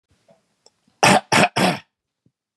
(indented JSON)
{
  "three_cough_length": "2.6 s",
  "three_cough_amplitude": 32213,
  "three_cough_signal_mean_std_ratio": 0.36,
  "survey_phase": "beta (2021-08-13 to 2022-03-07)",
  "age": "45-64",
  "gender": "Male",
  "wearing_mask": "No",
  "symptom_none": true,
  "symptom_onset": "8 days",
  "smoker_status": "Ex-smoker",
  "respiratory_condition_asthma": false,
  "respiratory_condition_other": false,
  "recruitment_source": "REACT",
  "submission_delay": "1 day",
  "covid_test_result": "Negative",
  "covid_test_method": "RT-qPCR",
  "influenza_a_test_result": "Negative",
  "influenza_b_test_result": "Negative"
}